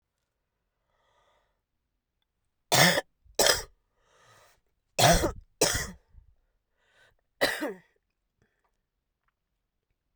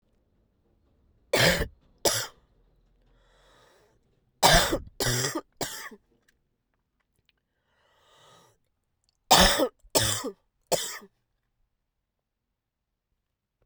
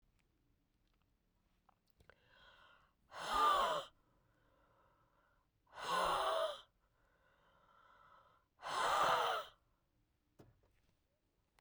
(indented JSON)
{
  "cough_length": "10.2 s",
  "cough_amplitude": 23412,
  "cough_signal_mean_std_ratio": 0.27,
  "three_cough_length": "13.7 s",
  "three_cough_amplitude": 22403,
  "three_cough_signal_mean_std_ratio": 0.3,
  "exhalation_length": "11.6 s",
  "exhalation_amplitude": 2510,
  "exhalation_signal_mean_std_ratio": 0.37,
  "survey_phase": "beta (2021-08-13 to 2022-03-07)",
  "age": "18-44",
  "gender": "Female",
  "wearing_mask": "No",
  "symptom_cough_any": true,
  "symptom_new_continuous_cough": true,
  "symptom_runny_or_blocked_nose": true,
  "symptom_shortness_of_breath": true,
  "symptom_abdominal_pain": true,
  "symptom_diarrhoea": true,
  "symptom_fatigue": true,
  "symptom_change_to_sense_of_smell_or_taste": true,
  "symptom_other": true,
  "symptom_onset": "8 days",
  "smoker_status": "Current smoker (11 or more cigarettes per day)",
  "respiratory_condition_asthma": true,
  "respiratory_condition_other": false,
  "recruitment_source": "Test and Trace",
  "submission_delay": "2 days",
  "covid_test_result": "Positive",
  "covid_test_method": "ePCR"
}